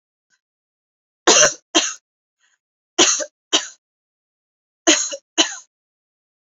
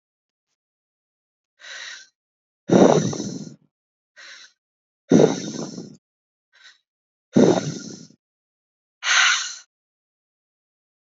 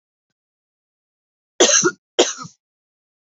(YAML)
three_cough_length: 6.5 s
three_cough_amplitude: 32767
three_cough_signal_mean_std_ratio: 0.31
exhalation_length: 11.0 s
exhalation_amplitude: 27340
exhalation_signal_mean_std_ratio: 0.31
cough_length: 3.2 s
cough_amplitude: 30406
cough_signal_mean_std_ratio: 0.28
survey_phase: beta (2021-08-13 to 2022-03-07)
age: 18-44
gender: Female
wearing_mask: 'No'
symptom_none: true
smoker_status: Current smoker (1 to 10 cigarettes per day)
respiratory_condition_asthma: false
respiratory_condition_other: false
recruitment_source: REACT
submission_delay: 2 days
covid_test_result: Negative
covid_test_method: RT-qPCR
influenza_a_test_result: Negative
influenza_b_test_result: Negative